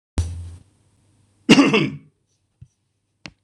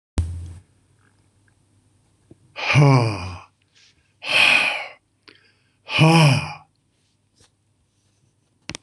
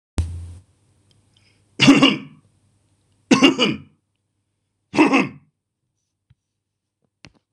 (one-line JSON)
{"cough_length": "3.4 s", "cough_amplitude": 26028, "cough_signal_mean_std_ratio": 0.31, "exhalation_length": "8.8 s", "exhalation_amplitude": 25877, "exhalation_signal_mean_std_ratio": 0.38, "three_cough_length": "7.5 s", "three_cough_amplitude": 26028, "three_cough_signal_mean_std_ratio": 0.31, "survey_phase": "beta (2021-08-13 to 2022-03-07)", "age": "65+", "gender": "Male", "wearing_mask": "No", "symptom_none": true, "smoker_status": "Ex-smoker", "respiratory_condition_asthma": false, "respiratory_condition_other": false, "recruitment_source": "REACT", "submission_delay": "1 day", "covid_test_result": "Negative", "covid_test_method": "RT-qPCR", "influenza_a_test_result": "Negative", "influenza_b_test_result": "Negative"}